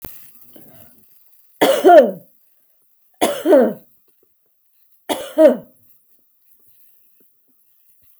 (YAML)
three_cough_length: 8.2 s
three_cough_amplitude: 32766
three_cough_signal_mean_std_ratio: 0.3
survey_phase: beta (2021-08-13 to 2022-03-07)
age: 45-64
gender: Female
wearing_mask: 'No'
symptom_none: true
smoker_status: Ex-smoker
respiratory_condition_asthma: false
respiratory_condition_other: false
recruitment_source: REACT
submission_delay: 1 day
covid_test_result: Negative
covid_test_method: RT-qPCR
influenza_a_test_result: Negative
influenza_b_test_result: Negative